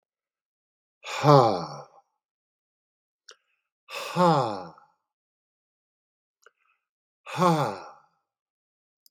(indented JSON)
{
  "exhalation_length": "9.1 s",
  "exhalation_amplitude": 24888,
  "exhalation_signal_mean_std_ratio": 0.28,
  "survey_phase": "beta (2021-08-13 to 2022-03-07)",
  "age": "65+",
  "gender": "Male",
  "wearing_mask": "No",
  "symptom_cough_any": true,
  "smoker_status": "Current smoker (1 to 10 cigarettes per day)",
  "respiratory_condition_asthma": false,
  "respiratory_condition_other": false,
  "recruitment_source": "REACT",
  "submission_delay": "2 days",
  "covid_test_result": "Negative",
  "covid_test_method": "RT-qPCR",
  "influenza_a_test_result": "Unknown/Void",
  "influenza_b_test_result": "Unknown/Void"
}